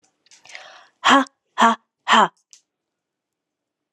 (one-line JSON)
{"exhalation_length": "3.9 s", "exhalation_amplitude": 31269, "exhalation_signal_mean_std_ratio": 0.3, "survey_phase": "alpha (2021-03-01 to 2021-08-12)", "age": "45-64", "gender": "Female", "wearing_mask": "No", "symptom_none": true, "symptom_onset": "9 days", "smoker_status": "Ex-smoker", "respiratory_condition_asthma": true, "respiratory_condition_other": false, "recruitment_source": "REACT", "submission_delay": "2 days", "covid_test_result": "Negative", "covid_test_method": "RT-qPCR"}